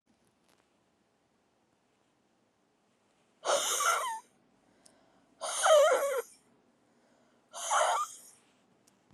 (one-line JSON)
{"exhalation_length": "9.1 s", "exhalation_amplitude": 9273, "exhalation_signal_mean_std_ratio": 0.37, "survey_phase": "beta (2021-08-13 to 2022-03-07)", "age": "45-64", "gender": "Female", "wearing_mask": "No", "symptom_cough_any": true, "symptom_new_continuous_cough": true, "symptom_shortness_of_breath": true, "symptom_abdominal_pain": true, "symptom_fatigue": true, "symptom_fever_high_temperature": true, "symptom_headache": true, "symptom_change_to_sense_of_smell_or_taste": true, "symptom_loss_of_taste": true, "symptom_onset": "5 days", "smoker_status": "Never smoked", "respiratory_condition_asthma": false, "respiratory_condition_other": false, "recruitment_source": "Test and Trace", "submission_delay": "2 days", "covid_test_result": "Positive", "covid_test_method": "ePCR"}